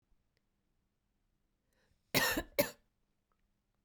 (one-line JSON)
{"cough_length": "3.8 s", "cough_amplitude": 6731, "cough_signal_mean_std_ratio": 0.24, "survey_phase": "beta (2021-08-13 to 2022-03-07)", "age": "45-64", "gender": "Female", "wearing_mask": "No", "symptom_cough_any": true, "symptom_runny_or_blocked_nose": true, "symptom_sore_throat": true, "symptom_onset": "3 days", "smoker_status": "Never smoked", "respiratory_condition_asthma": false, "respiratory_condition_other": false, "recruitment_source": "Test and Trace", "submission_delay": "1 day", "covid_test_result": "Positive", "covid_test_method": "ePCR"}